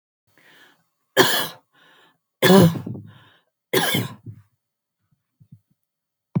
{"three_cough_length": "6.4 s", "three_cough_amplitude": 30289, "three_cough_signal_mean_std_ratio": 0.31, "survey_phase": "beta (2021-08-13 to 2022-03-07)", "age": "45-64", "gender": "Female", "wearing_mask": "No", "symptom_none": true, "smoker_status": "Never smoked", "respiratory_condition_asthma": false, "respiratory_condition_other": false, "recruitment_source": "REACT", "submission_delay": "0 days", "covid_test_result": "Negative", "covid_test_method": "RT-qPCR", "influenza_a_test_result": "Negative", "influenza_b_test_result": "Negative"}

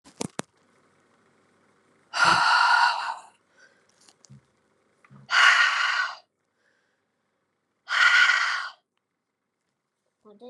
{"exhalation_length": "10.5 s", "exhalation_amplitude": 23837, "exhalation_signal_mean_std_ratio": 0.4, "survey_phase": "beta (2021-08-13 to 2022-03-07)", "age": "18-44", "gender": "Female", "wearing_mask": "No", "symptom_cough_any": true, "symptom_runny_or_blocked_nose": true, "symptom_fatigue": true, "symptom_headache": true, "symptom_change_to_sense_of_smell_or_taste": true, "smoker_status": "Ex-smoker", "respiratory_condition_asthma": false, "respiratory_condition_other": false, "recruitment_source": "Test and Trace", "submission_delay": "2 days", "covid_test_result": "Positive", "covid_test_method": "RT-qPCR", "covid_ct_value": 20.8, "covid_ct_gene": "ORF1ab gene", "covid_ct_mean": 21.0, "covid_viral_load": "130000 copies/ml", "covid_viral_load_category": "Low viral load (10K-1M copies/ml)"}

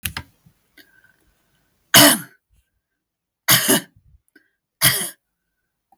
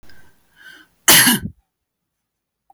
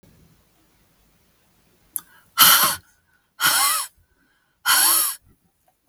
{"three_cough_length": "6.0 s", "three_cough_amplitude": 32768, "three_cough_signal_mean_std_ratio": 0.28, "cough_length": "2.7 s", "cough_amplitude": 32768, "cough_signal_mean_std_ratio": 0.3, "exhalation_length": "5.9 s", "exhalation_amplitude": 32768, "exhalation_signal_mean_std_ratio": 0.38, "survey_phase": "beta (2021-08-13 to 2022-03-07)", "age": "45-64", "gender": "Female", "wearing_mask": "No", "symptom_none": true, "smoker_status": "Never smoked", "respiratory_condition_asthma": false, "respiratory_condition_other": false, "recruitment_source": "REACT", "submission_delay": "1 day", "covid_test_result": "Negative", "covid_test_method": "RT-qPCR", "influenza_a_test_result": "Unknown/Void", "influenza_b_test_result": "Unknown/Void"}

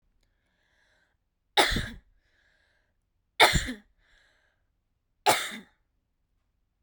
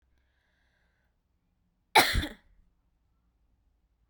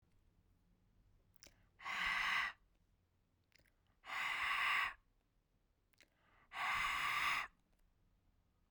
{"three_cough_length": "6.8 s", "three_cough_amplitude": 25862, "three_cough_signal_mean_std_ratio": 0.24, "cough_length": "4.1 s", "cough_amplitude": 17618, "cough_signal_mean_std_ratio": 0.19, "exhalation_length": "8.7 s", "exhalation_amplitude": 1606, "exhalation_signal_mean_std_ratio": 0.47, "survey_phase": "beta (2021-08-13 to 2022-03-07)", "age": "18-44", "gender": "Female", "wearing_mask": "No", "symptom_fatigue": true, "smoker_status": "Ex-smoker", "respiratory_condition_asthma": false, "respiratory_condition_other": false, "recruitment_source": "REACT", "submission_delay": "1 day", "covid_test_result": "Negative", "covid_test_method": "RT-qPCR"}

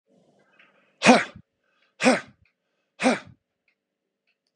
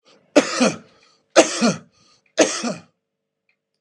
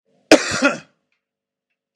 {"exhalation_length": "4.6 s", "exhalation_amplitude": 29440, "exhalation_signal_mean_std_ratio": 0.26, "three_cough_length": "3.8 s", "three_cough_amplitude": 32767, "three_cough_signal_mean_std_ratio": 0.36, "cough_length": "2.0 s", "cough_amplitude": 32768, "cough_signal_mean_std_ratio": 0.28, "survey_phase": "beta (2021-08-13 to 2022-03-07)", "age": "45-64", "gender": "Male", "wearing_mask": "No", "symptom_prefer_not_to_say": true, "smoker_status": "Ex-smoker", "respiratory_condition_asthma": false, "respiratory_condition_other": false, "recruitment_source": "REACT", "submission_delay": "1 day", "covid_test_result": "Negative", "covid_test_method": "RT-qPCR"}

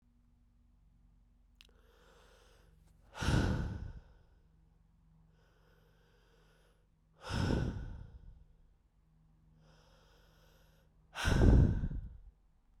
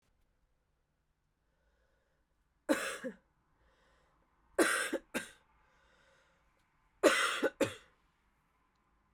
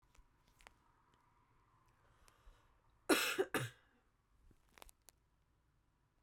{"exhalation_length": "12.8 s", "exhalation_amplitude": 8803, "exhalation_signal_mean_std_ratio": 0.32, "three_cough_length": "9.1 s", "three_cough_amplitude": 8184, "three_cough_signal_mean_std_ratio": 0.28, "cough_length": "6.2 s", "cough_amplitude": 3589, "cough_signal_mean_std_ratio": 0.24, "survey_phase": "beta (2021-08-13 to 2022-03-07)", "age": "18-44", "gender": "Female", "wearing_mask": "No", "symptom_cough_any": true, "symptom_runny_or_blocked_nose": true, "symptom_sore_throat": true, "symptom_fatigue": true, "symptom_headache": true, "symptom_onset": "6 days", "smoker_status": "Never smoked", "respiratory_condition_asthma": false, "respiratory_condition_other": false, "recruitment_source": "Test and Trace", "submission_delay": "2 days", "covid_test_result": "Positive", "covid_test_method": "RT-qPCR", "covid_ct_value": 20.0, "covid_ct_gene": "S gene", "covid_ct_mean": 20.3, "covid_viral_load": "220000 copies/ml", "covid_viral_load_category": "Low viral load (10K-1M copies/ml)"}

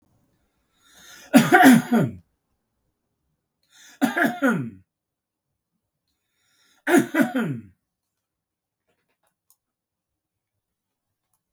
{"three_cough_length": "11.5 s", "three_cough_amplitude": 32766, "three_cough_signal_mean_std_ratio": 0.28, "survey_phase": "beta (2021-08-13 to 2022-03-07)", "age": "65+", "gender": "Male", "wearing_mask": "No", "symptom_none": true, "smoker_status": "Ex-smoker", "respiratory_condition_asthma": false, "respiratory_condition_other": false, "recruitment_source": "REACT", "submission_delay": "10 days", "covid_test_result": "Negative", "covid_test_method": "RT-qPCR"}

